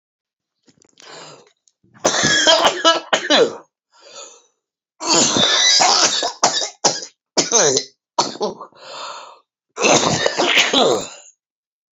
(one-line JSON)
{"cough_length": "11.9 s", "cough_amplitude": 32767, "cough_signal_mean_std_ratio": 0.55, "survey_phase": "alpha (2021-03-01 to 2021-08-12)", "age": "45-64", "gender": "Female", "wearing_mask": "No", "symptom_cough_any": true, "symptom_shortness_of_breath": true, "symptom_fatigue": true, "symptom_headache": true, "smoker_status": "Ex-smoker", "respiratory_condition_asthma": false, "respiratory_condition_other": false, "recruitment_source": "REACT", "submission_delay": "1 day", "covid_test_result": "Negative", "covid_test_method": "RT-qPCR"}